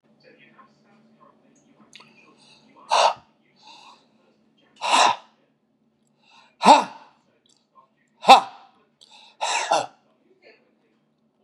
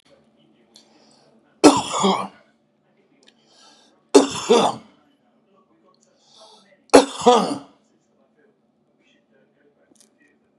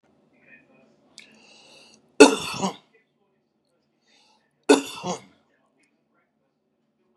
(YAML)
exhalation_length: 11.4 s
exhalation_amplitude: 32768
exhalation_signal_mean_std_ratio: 0.24
three_cough_length: 10.6 s
three_cough_amplitude: 32768
three_cough_signal_mean_std_ratio: 0.26
cough_length: 7.2 s
cough_amplitude: 32768
cough_signal_mean_std_ratio: 0.18
survey_phase: beta (2021-08-13 to 2022-03-07)
age: 65+
gender: Male
wearing_mask: 'No'
symptom_none: true
smoker_status: Ex-smoker
respiratory_condition_asthma: false
respiratory_condition_other: false
recruitment_source: REACT
submission_delay: 2 days
covid_test_result: Negative
covid_test_method: RT-qPCR
influenza_a_test_result: Negative
influenza_b_test_result: Negative